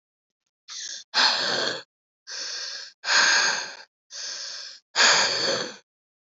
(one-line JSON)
{"exhalation_length": "6.2 s", "exhalation_amplitude": 18266, "exhalation_signal_mean_std_ratio": 0.54, "survey_phase": "alpha (2021-03-01 to 2021-08-12)", "age": "18-44", "gender": "Female", "wearing_mask": "No", "symptom_new_continuous_cough": true, "symptom_shortness_of_breath": true, "symptom_fatigue": true, "symptom_headache": true, "symptom_onset": "6 days", "smoker_status": "Never smoked", "respiratory_condition_asthma": true, "respiratory_condition_other": false, "recruitment_source": "Test and Trace", "submission_delay": "2 days", "covid_test_result": "Positive", "covid_test_method": "RT-qPCR", "covid_ct_value": 36.4, "covid_ct_gene": "N gene"}